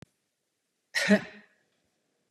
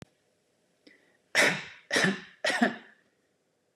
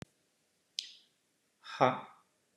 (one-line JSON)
{"cough_length": "2.3 s", "cough_amplitude": 13373, "cough_signal_mean_std_ratio": 0.25, "three_cough_length": "3.8 s", "three_cough_amplitude": 10150, "three_cough_signal_mean_std_ratio": 0.37, "exhalation_length": "2.6 s", "exhalation_amplitude": 9424, "exhalation_signal_mean_std_ratio": 0.22, "survey_phase": "beta (2021-08-13 to 2022-03-07)", "age": "45-64", "gender": "Male", "wearing_mask": "No", "symptom_none": true, "smoker_status": "Never smoked", "respiratory_condition_asthma": false, "respiratory_condition_other": false, "recruitment_source": "REACT", "submission_delay": "1 day", "covid_test_result": "Negative", "covid_test_method": "RT-qPCR", "influenza_a_test_result": "Negative", "influenza_b_test_result": "Negative"}